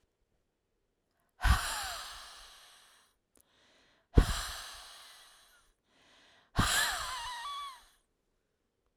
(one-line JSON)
{"exhalation_length": "9.0 s", "exhalation_amplitude": 12404, "exhalation_signal_mean_std_ratio": 0.33, "survey_phase": "alpha (2021-03-01 to 2021-08-12)", "age": "45-64", "gender": "Female", "wearing_mask": "No", "symptom_none": true, "smoker_status": "Never smoked", "respiratory_condition_asthma": false, "respiratory_condition_other": false, "recruitment_source": "REACT", "submission_delay": "2 days", "covid_test_result": "Negative", "covid_test_method": "RT-qPCR"}